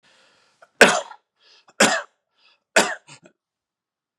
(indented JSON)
{
  "three_cough_length": "4.2 s",
  "three_cough_amplitude": 32768,
  "three_cough_signal_mean_std_ratio": 0.26,
  "survey_phase": "beta (2021-08-13 to 2022-03-07)",
  "age": "45-64",
  "gender": "Male",
  "wearing_mask": "No",
  "symptom_none": true,
  "smoker_status": "Never smoked",
  "respiratory_condition_asthma": false,
  "respiratory_condition_other": false,
  "recruitment_source": "REACT",
  "submission_delay": "1 day",
  "covid_test_result": "Negative",
  "covid_test_method": "RT-qPCR",
  "influenza_a_test_result": "Negative",
  "influenza_b_test_result": "Negative"
}